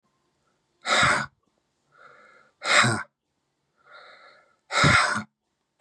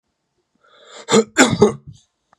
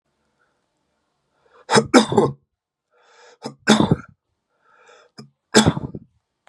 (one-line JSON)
{"exhalation_length": "5.8 s", "exhalation_amplitude": 18788, "exhalation_signal_mean_std_ratio": 0.38, "cough_length": "2.4 s", "cough_amplitude": 32767, "cough_signal_mean_std_ratio": 0.34, "three_cough_length": "6.5 s", "three_cough_amplitude": 32768, "three_cough_signal_mean_std_ratio": 0.29, "survey_phase": "beta (2021-08-13 to 2022-03-07)", "age": "45-64", "gender": "Male", "wearing_mask": "No", "symptom_runny_or_blocked_nose": true, "symptom_onset": "7 days", "smoker_status": "Ex-smoker", "respiratory_condition_asthma": false, "respiratory_condition_other": false, "recruitment_source": "REACT", "submission_delay": "3 days", "covid_test_result": "Positive", "covid_test_method": "RT-qPCR", "covid_ct_value": 26.0, "covid_ct_gene": "E gene", "influenza_a_test_result": "Unknown/Void", "influenza_b_test_result": "Unknown/Void"}